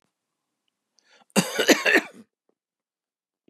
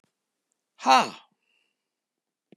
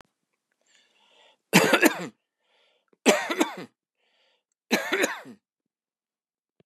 cough_length: 3.5 s
cough_amplitude: 26548
cough_signal_mean_std_ratio: 0.28
exhalation_length: 2.6 s
exhalation_amplitude: 21194
exhalation_signal_mean_std_ratio: 0.21
three_cough_length: 6.7 s
three_cough_amplitude: 25581
three_cough_signal_mean_std_ratio: 0.3
survey_phase: beta (2021-08-13 to 2022-03-07)
age: 65+
gender: Male
wearing_mask: 'No'
symptom_none: true
smoker_status: Never smoked
respiratory_condition_asthma: false
respiratory_condition_other: false
recruitment_source: REACT
submission_delay: 1 day
covid_test_result: Negative
covid_test_method: RT-qPCR
influenza_a_test_result: Negative
influenza_b_test_result: Negative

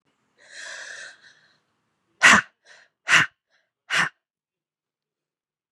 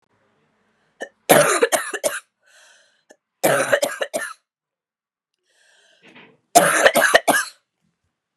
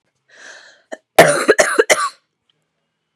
exhalation_length: 5.7 s
exhalation_amplitude: 30550
exhalation_signal_mean_std_ratio: 0.25
three_cough_length: 8.4 s
three_cough_amplitude: 32768
three_cough_signal_mean_std_ratio: 0.37
cough_length: 3.2 s
cough_amplitude: 32768
cough_signal_mean_std_ratio: 0.35
survey_phase: beta (2021-08-13 to 2022-03-07)
age: 18-44
gender: Female
wearing_mask: 'No'
symptom_cough_any: true
symptom_runny_or_blocked_nose: true
symptom_shortness_of_breath: true
symptom_abdominal_pain: true
symptom_diarrhoea: true
symptom_fever_high_temperature: true
symptom_headache: true
symptom_change_to_sense_of_smell_or_taste: true
symptom_onset: 5 days
smoker_status: Never smoked
respiratory_condition_asthma: false
respiratory_condition_other: false
recruitment_source: Test and Trace
submission_delay: 1 day
covid_test_result: Positive
covid_test_method: RT-qPCR
covid_ct_value: 34.7
covid_ct_gene: ORF1ab gene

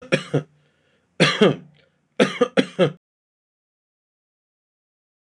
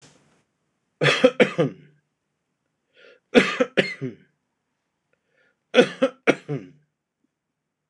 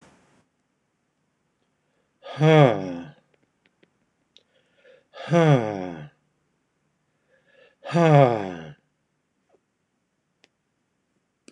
cough_length: 5.3 s
cough_amplitude: 26028
cough_signal_mean_std_ratio: 0.3
three_cough_length: 7.9 s
three_cough_amplitude: 26028
three_cough_signal_mean_std_ratio: 0.28
exhalation_length: 11.5 s
exhalation_amplitude: 24358
exhalation_signal_mean_std_ratio: 0.27
survey_phase: beta (2021-08-13 to 2022-03-07)
age: 65+
gender: Male
wearing_mask: 'No'
symptom_none: true
smoker_status: Ex-smoker
respiratory_condition_asthma: false
respiratory_condition_other: false
recruitment_source: REACT
submission_delay: 1 day
covid_test_result: Negative
covid_test_method: RT-qPCR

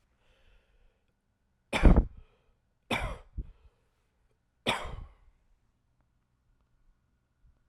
three_cough_length: 7.7 s
three_cough_amplitude: 16469
three_cough_signal_mean_std_ratio: 0.21
survey_phase: alpha (2021-03-01 to 2021-08-12)
age: 18-44
gender: Male
wearing_mask: 'No'
symptom_none: true
smoker_status: Ex-smoker
respiratory_condition_asthma: false
respiratory_condition_other: false
recruitment_source: REACT
submission_delay: 1 day
covid_test_result: Negative
covid_test_method: RT-qPCR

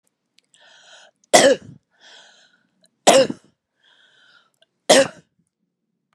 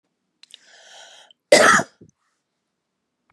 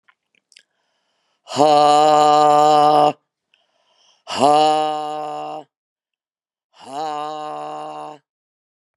three_cough_length: 6.1 s
three_cough_amplitude: 32768
three_cough_signal_mean_std_ratio: 0.26
cough_length: 3.3 s
cough_amplitude: 31247
cough_signal_mean_std_ratio: 0.25
exhalation_length: 9.0 s
exhalation_amplitude: 31217
exhalation_signal_mean_std_ratio: 0.47
survey_phase: beta (2021-08-13 to 2022-03-07)
age: 45-64
gender: Female
wearing_mask: 'No'
symptom_cough_any: true
symptom_diarrhoea: true
smoker_status: Current smoker (11 or more cigarettes per day)
respiratory_condition_asthma: false
respiratory_condition_other: false
recruitment_source: REACT
submission_delay: 3 days
covid_test_result: Negative
covid_test_method: RT-qPCR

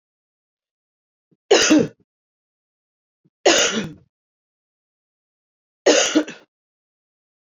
three_cough_length: 7.4 s
three_cough_amplitude: 27258
three_cough_signal_mean_std_ratio: 0.3
survey_phase: beta (2021-08-13 to 2022-03-07)
age: 45-64
gender: Female
wearing_mask: 'Yes'
symptom_runny_or_blocked_nose: true
symptom_sore_throat: true
symptom_fatigue: true
symptom_headache: true
symptom_other: true
symptom_onset: 3 days
smoker_status: Never smoked
respiratory_condition_asthma: false
respiratory_condition_other: false
recruitment_source: Test and Trace
submission_delay: 1 day
covid_test_result: Positive
covid_test_method: RT-qPCR
covid_ct_value: 21.8
covid_ct_gene: ORF1ab gene
covid_ct_mean: 22.3
covid_viral_load: 48000 copies/ml
covid_viral_load_category: Low viral load (10K-1M copies/ml)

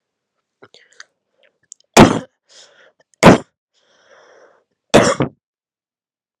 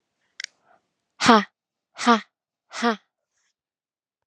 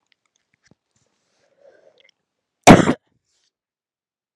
three_cough_length: 6.4 s
three_cough_amplitude: 32768
three_cough_signal_mean_std_ratio: 0.24
exhalation_length: 4.3 s
exhalation_amplitude: 32635
exhalation_signal_mean_std_ratio: 0.25
cough_length: 4.4 s
cough_amplitude: 32768
cough_signal_mean_std_ratio: 0.17
survey_phase: alpha (2021-03-01 to 2021-08-12)
age: 18-44
gender: Female
wearing_mask: 'No'
symptom_cough_any: true
symptom_fatigue: true
symptom_headache: true
smoker_status: Never smoked
respiratory_condition_asthma: false
respiratory_condition_other: false
recruitment_source: Test and Trace
submission_delay: 1 day
covid_test_result: Positive
covid_test_method: RT-qPCR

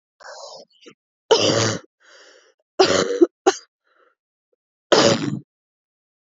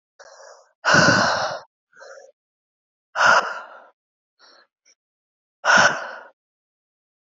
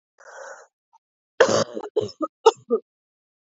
three_cough_length: 6.3 s
three_cough_amplitude: 27643
three_cough_signal_mean_std_ratio: 0.36
exhalation_length: 7.3 s
exhalation_amplitude: 24713
exhalation_signal_mean_std_ratio: 0.36
cough_length: 3.5 s
cough_amplitude: 27402
cough_signal_mean_std_ratio: 0.3
survey_phase: alpha (2021-03-01 to 2021-08-12)
age: 18-44
gender: Female
wearing_mask: 'No'
symptom_cough_any: true
symptom_shortness_of_breath: true
symptom_abdominal_pain: true
symptom_fatigue: true
symptom_headache: true
symptom_change_to_sense_of_smell_or_taste: true
smoker_status: Never smoked
respiratory_condition_asthma: true
respiratory_condition_other: false
recruitment_source: Test and Trace
submission_delay: 1 day
covid_test_result: Positive
covid_test_method: RT-qPCR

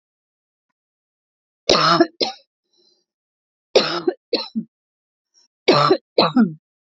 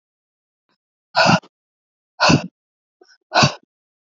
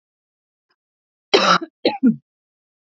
three_cough_length: 6.8 s
three_cough_amplitude: 29693
three_cough_signal_mean_std_ratio: 0.35
exhalation_length: 4.2 s
exhalation_amplitude: 29022
exhalation_signal_mean_std_ratio: 0.31
cough_length: 2.9 s
cough_amplitude: 28692
cough_signal_mean_std_ratio: 0.32
survey_phase: alpha (2021-03-01 to 2021-08-12)
age: 45-64
gender: Female
wearing_mask: 'No'
symptom_none: true
smoker_status: Ex-smoker
respiratory_condition_asthma: false
respiratory_condition_other: false
recruitment_source: REACT
submission_delay: 2 days
covid_test_result: Negative
covid_test_method: RT-qPCR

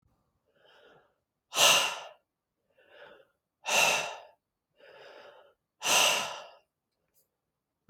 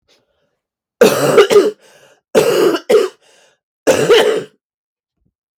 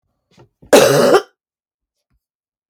exhalation_length: 7.9 s
exhalation_amplitude: 12582
exhalation_signal_mean_std_ratio: 0.33
three_cough_length: 5.6 s
three_cough_amplitude: 32766
three_cough_signal_mean_std_ratio: 0.49
cough_length: 2.7 s
cough_amplitude: 32768
cough_signal_mean_std_ratio: 0.35
survey_phase: beta (2021-08-13 to 2022-03-07)
age: 45-64
gender: Female
wearing_mask: 'No'
symptom_cough_any: true
symptom_runny_or_blocked_nose: true
symptom_sore_throat: true
symptom_fatigue: true
symptom_fever_high_temperature: true
symptom_headache: true
symptom_onset: 3 days
smoker_status: Ex-smoker
respiratory_condition_asthma: false
respiratory_condition_other: false
recruitment_source: Test and Trace
submission_delay: 1 day
covid_test_result: Positive
covid_test_method: RT-qPCR
covid_ct_value: 29.3
covid_ct_gene: ORF1ab gene
covid_ct_mean: 29.6
covid_viral_load: 190 copies/ml
covid_viral_load_category: Minimal viral load (< 10K copies/ml)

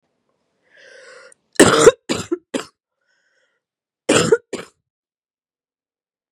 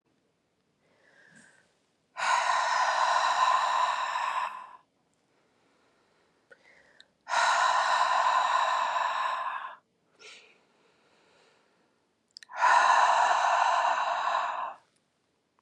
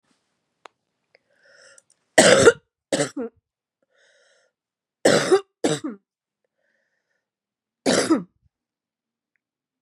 cough_length: 6.3 s
cough_amplitude: 32768
cough_signal_mean_std_ratio: 0.26
exhalation_length: 15.6 s
exhalation_amplitude: 9666
exhalation_signal_mean_std_ratio: 0.59
three_cough_length: 9.8 s
three_cough_amplitude: 32767
three_cough_signal_mean_std_ratio: 0.28
survey_phase: beta (2021-08-13 to 2022-03-07)
age: 18-44
gender: Female
wearing_mask: 'No'
symptom_cough_any: true
symptom_new_continuous_cough: true
symptom_runny_or_blocked_nose: true
symptom_shortness_of_breath: true
symptom_sore_throat: true
symptom_fatigue: true
symptom_headache: true
symptom_change_to_sense_of_smell_or_taste: true
symptom_onset: 3 days
smoker_status: Ex-smoker
respiratory_condition_asthma: true
respiratory_condition_other: false
recruitment_source: Test and Trace
submission_delay: 2 days
covid_test_result: Positive
covid_test_method: RT-qPCR
covid_ct_value: 24.5
covid_ct_gene: ORF1ab gene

